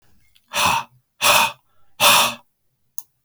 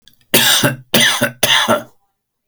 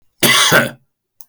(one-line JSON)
{"exhalation_length": "3.2 s", "exhalation_amplitude": 30154, "exhalation_signal_mean_std_ratio": 0.43, "three_cough_length": "2.5 s", "three_cough_amplitude": 32768, "three_cough_signal_mean_std_ratio": 0.59, "cough_length": "1.3 s", "cough_amplitude": 32768, "cough_signal_mean_std_ratio": 0.52, "survey_phase": "beta (2021-08-13 to 2022-03-07)", "age": "45-64", "gender": "Male", "wearing_mask": "No", "symptom_none": true, "smoker_status": "Never smoked", "respiratory_condition_asthma": false, "respiratory_condition_other": false, "recruitment_source": "REACT", "submission_delay": "2 days", "covid_test_result": "Negative", "covid_test_method": "RT-qPCR"}